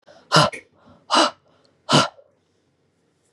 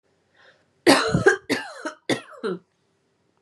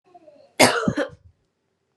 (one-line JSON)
{"exhalation_length": "3.3 s", "exhalation_amplitude": 31226, "exhalation_signal_mean_std_ratio": 0.33, "three_cough_length": "3.4 s", "three_cough_amplitude": 28841, "three_cough_signal_mean_std_ratio": 0.37, "cough_length": "2.0 s", "cough_amplitude": 32767, "cough_signal_mean_std_ratio": 0.33, "survey_phase": "beta (2021-08-13 to 2022-03-07)", "age": "18-44", "gender": "Female", "wearing_mask": "No", "symptom_cough_any": true, "symptom_runny_or_blocked_nose": true, "symptom_sore_throat": true, "symptom_onset": "3 days", "smoker_status": "Never smoked", "respiratory_condition_asthma": false, "respiratory_condition_other": false, "recruitment_source": "Test and Trace", "submission_delay": "1 day", "covid_test_result": "Positive", "covid_test_method": "RT-qPCR", "covid_ct_value": 14.9, "covid_ct_gene": "N gene", "covid_ct_mean": 15.1, "covid_viral_load": "11000000 copies/ml", "covid_viral_load_category": "High viral load (>1M copies/ml)"}